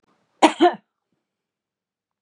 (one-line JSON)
{"cough_length": "2.2 s", "cough_amplitude": 30620, "cough_signal_mean_std_ratio": 0.23, "survey_phase": "beta (2021-08-13 to 2022-03-07)", "age": "45-64", "gender": "Female", "wearing_mask": "No", "symptom_none": true, "smoker_status": "Never smoked", "respiratory_condition_asthma": false, "respiratory_condition_other": false, "recruitment_source": "REACT", "submission_delay": "1 day", "covid_test_result": "Negative", "covid_test_method": "RT-qPCR", "influenza_a_test_result": "Negative", "influenza_b_test_result": "Negative"}